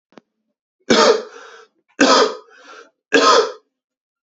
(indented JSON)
{
  "three_cough_length": "4.3 s",
  "three_cough_amplitude": 32768,
  "three_cough_signal_mean_std_ratio": 0.41,
  "survey_phase": "beta (2021-08-13 to 2022-03-07)",
  "age": "18-44",
  "gender": "Male",
  "wearing_mask": "No",
  "symptom_cough_any": true,
  "symptom_runny_or_blocked_nose": true,
  "symptom_sore_throat": true,
  "symptom_diarrhoea": true,
  "symptom_fatigue": true,
  "symptom_headache": true,
  "symptom_loss_of_taste": true,
  "symptom_onset": "4 days",
  "smoker_status": "Never smoked",
  "respiratory_condition_asthma": false,
  "respiratory_condition_other": false,
  "recruitment_source": "Test and Trace",
  "submission_delay": "1 day",
  "covid_test_result": "Positive",
  "covid_test_method": "RT-qPCR",
  "covid_ct_value": 23.9,
  "covid_ct_gene": "ORF1ab gene"
}